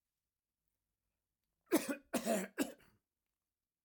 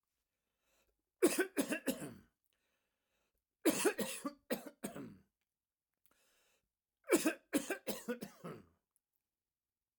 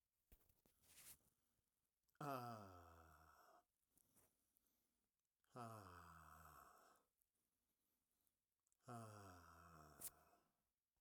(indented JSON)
{
  "cough_length": "3.8 s",
  "cough_amplitude": 4390,
  "cough_signal_mean_std_ratio": 0.3,
  "three_cough_length": "10.0 s",
  "three_cough_amplitude": 4477,
  "three_cough_signal_mean_std_ratio": 0.33,
  "exhalation_length": "11.0 s",
  "exhalation_amplitude": 466,
  "exhalation_signal_mean_std_ratio": 0.4,
  "survey_phase": "alpha (2021-03-01 to 2021-08-12)",
  "age": "45-64",
  "gender": "Male",
  "wearing_mask": "No",
  "symptom_none": true,
  "smoker_status": "Never smoked",
  "respiratory_condition_asthma": false,
  "respiratory_condition_other": false,
  "recruitment_source": "REACT",
  "submission_delay": "5 days",
  "covid_test_result": "Negative",
  "covid_test_method": "RT-qPCR"
}